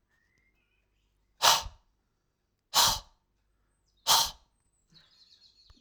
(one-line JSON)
{"exhalation_length": "5.8 s", "exhalation_amplitude": 16219, "exhalation_signal_mean_std_ratio": 0.26, "survey_phase": "alpha (2021-03-01 to 2021-08-12)", "age": "45-64", "gender": "Male", "wearing_mask": "No", "symptom_none": true, "smoker_status": "Ex-smoker", "respiratory_condition_asthma": false, "respiratory_condition_other": false, "recruitment_source": "Test and Trace", "submission_delay": "1 day", "covid_test_result": "Positive", "covid_test_method": "RT-qPCR", "covid_ct_value": 12.1, "covid_ct_gene": "ORF1ab gene", "covid_ct_mean": 12.4, "covid_viral_load": "88000000 copies/ml", "covid_viral_load_category": "High viral load (>1M copies/ml)"}